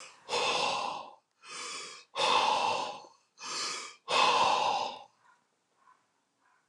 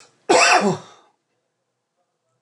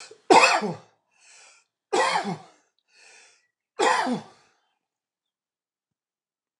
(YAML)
exhalation_length: 6.7 s
exhalation_amplitude: 6755
exhalation_signal_mean_std_ratio: 0.58
cough_length: 2.4 s
cough_amplitude: 26849
cough_signal_mean_std_ratio: 0.36
three_cough_length: 6.6 s
three_cough_amplitude: 26013
three_cough_signal_mean_std_ratio: 0.32
survey_phase: alpha (2021-03-01 to 2021-08-12)
age: 45-64
gender: Male
wearing_mask: 'No'
symptom_none: true
smoker_status: Never smoked
respiratory_condition_asthma: false
respiratory_condition_other: false
recruitment_source: REACT
submission_delay: 1 day
covid_test_result: Negative
covid_test_method: RT-qPCR